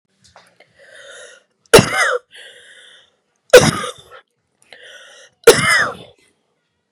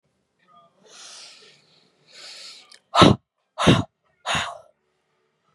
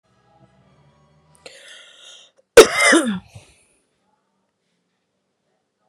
{"three_cough_length": "6.9 s", "three_cough_amplitude": 32768, "three_cough_signal_mean_std_ratio": 0.29, "exhalation_length": "5.5 s", "exhalation_amplitude": 31397, "exhalation_signal_mean_std_ratio": 0.26, "cough_length": "5.9 s", "cough_amplitude": 32768, "cough_signal_mean_std_ratio": 0.21, "survey_phase": "beta (2021-08-13 to 2022-03-07)", "age": "18-44", "gender": "Female", "wearing_mask": "No", "symptom_cough_any": true, "symptom_runny_or_blocked_nose": true, "symptom_headache": true, "smoker_status": "Never smoked", "respiratory_condition_asthma": false, "respiratory_condition_other": false, "recruitment_source": "Test and Trace", "submission_delay": "1 day", "covid_test_result": "Positive", "covid_test_method": "RT-qPCR", "covid_ct_value": 24.5, "covid_ct_gene": "ORF1ab gene"}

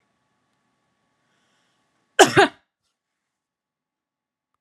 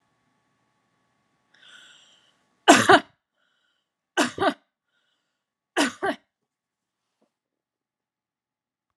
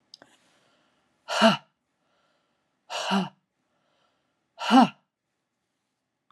{"cough_length": "4.6 s", "cough_amplitude": 32767, "cough_signal_mean_std_ratio": 0.16, "three_cough_length": "9.0 s", "three_cough_amplitude": 32435, "three_cough_signal_mean_std_ratio": 0.2, "exhalation_length": "6.3 s", "exhalation_amplitude": 20017, "exhalation_signal_mean_std_ratio": 0.25, "survey_phase": "alpha (2021-03-01 to 2021-08-12)", "age": "18-44", "gender": "Female", "wearing_mask": "No", "symptom_none": true, "smoker_status": "Never smoked", "respiratory_condition_asthma": false, "respiratory_condition_other": false, "recruitment_source": "REACT", "submission_delay": "2 days", "covid_test_result": "Negative", "covid_test_method": "RT-qPCR"}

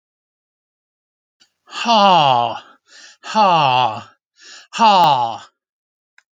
{"exhalation_length": "6.3 s", "exhalation_amplitude": 31801, "exhalation_signal_mean_std_ratio": 0.47, "survey_phase": "alpha (2021-03-01 to 2021-08-12)", "age": "65+", "gender": "Male", "wearing_mask": "No", "symptom_none": true, "smoker_status": "Never smoked", "respiratory_condition_asthma": true, "respiratory_condition_other": false, "recruitment_source": "REACT", "submission_delay": "3 days", "covid_test_result": "Negative", "covid_test_method": "RT-qPCR"}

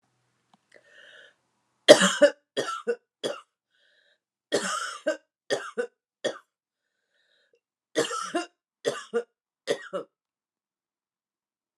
{"three_cough_length": "11.8 s", "three_cough_amplitude": 32767, "three_cough_signal_mean_std_ratio": 0.26, "survey_phase": "alpha (2021-03-01 to 2021-08-12)", "age": "65+", "gender": "Female", "wearing_mask": "No", "symptom_none": true, "smoker_status": "Never smoked", "respiratory_condition_asthma": false, "respiratory_condition_other": false, "recruitment_source": "REACT", "submission_delay": "1 day", "covid_test_result": "Negative", "covid_test_method": "RT-qPCR"}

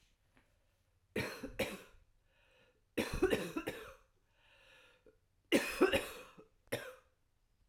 {"three_cough_length": "7.7 s", "three_cough_amplitude": 4813, "three_cough_signal_mean_std_ratio": 0.36, "survey_phase": "alpha (2021-03-01 to 2021-08-12)", "age": "45-64", "gender": "Female", "wearing_mask": "No", "symptom_cough_any": true, "symptom_shortness_of_breath": true, "symptom_fatigue": true, "symptom_headache": true, "smoker_status": "Current smoker (1 to 10 cigarettes per day)", "respiratory_condition_asthma": false, "respiratory_condition_other": false, "recruitment_source": "Test and Trace", "submission_delay": "1 day", "covid_test_result": "Positive", "covid_test_method": "RT-qPCR", "covid_ct_value": 15.2, "covid_ct_gene": "S gene", "covid_ct_mean": 15.6, "covid_viral_load": "7600000 copies/ml", "covid_viral_load_category": "High viral load (>1M copies/ml)"}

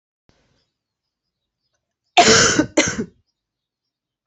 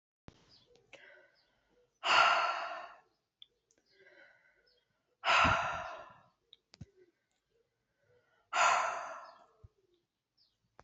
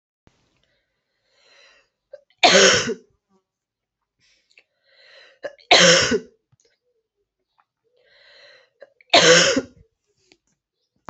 {"cough_length": "4.3 s", "cough_amplitude": 31921, "cough_signal_mean_std_ratio": 0.31, "exhalation_length": "10.8 s", "exhalation_amplitude": 7343, "exhalation_signal_mean_std_ratio": 0.33, "three_cough_length": "11.1 s", "three_cough_amplitude": 30985, "three_cough_signal_mean_std_ratio": 0.29, "survey_phase": "alpha (2021-03-01 to 2021-08-12)", "age": "18-44", "gender": "Female", "wearing_mask": "No", "symptom_cough_any": true, "symptom_fatigue": true, "symptom_headache": true, "smoker_status": "Ex-smoker", "respiratory_condition_asthma": false, "respiratory_condition_other": false, "recruitment_source": "Test and Trace", "submission_delay": "2 days", "covid_test_result": "Positive", "covid_test_method": "RT-qPCR", "covid_ct_value": 18.6, "covid_ct_gene": "ORF1ab gene"}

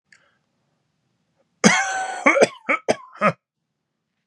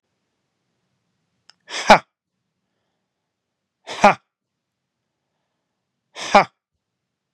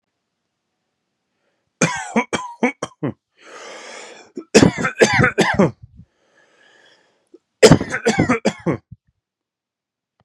{"cough_length": "4.3 s", "cough_amplitude": 32408, "cough_signal_mean_std_ratio": 0.35, "exhalation_length": "7.3 s", "exhalation_amplitude": 32768, "exhalation_signal_mean_std_ratio": 0.16, "three_cough_length": "10.2 s", "three_cough_amplitude": 32768, "three_cough_signal_mean_std_ratio": 0.34, "survey_phase": "beta (2021-08-13 to 2022-03-07)", "age": "18-44", "gender": "Male", "wearing_mask": "No", "symptom_none": true, "smoker_status": "Current smoker (1 to 10 cigarettes per day)", "respiratory_condition_asthma": true, "respiratory_condition_other": false, "recruitment_source": "REACT", "submission_delay": "1 day", "covid_test_result": "Negative", "covid_test_method": "RT-qPCR", "influenza_a_test_result": "Unknown/Void", "influenza_b_test_result": "Unknown/Void"}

